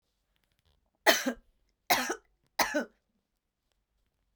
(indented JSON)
{
  "three_cough_length": "4.4 s",
  "three_cough_amplitude": 16075,
  "three_cough_signal_mean_std_ratio": 0.28,
  "survey_phase": "beta (2021-08-13 to 2022-03-07)",
  "age": "45-64",
  "gender": "Female",
  "wearing_mask": "No",
  "symptom_cough_any": true,
  "symptom_runny_or_blocked_nose": true,
  "symptom_sore_throat": true,
  "symptom_fatigue": true,
  "symptom_fever_high_temperature": true,
  "symptom_headache": true,
  "smoker_status": "Never smoked",
  "respiratory_condition_asthma": false,
  "respiratory_condition_other": false,
  "recruitment_source": "Test and Trace",
  "submission_delay": "1 day",
  "covid_test_result": "Positive",
  "covid_test_method": "RT-qPCR",
  "covid_ct_value": 23.6,
  "covid_ct_gene": "ORF1ab gene",
  "covid_ct_mean": 24.0,
  "covid_viral_load": "14000 copies/ml",
  "covid_viral_load_category": "Low viral load (10K-1M copies/ml)"
}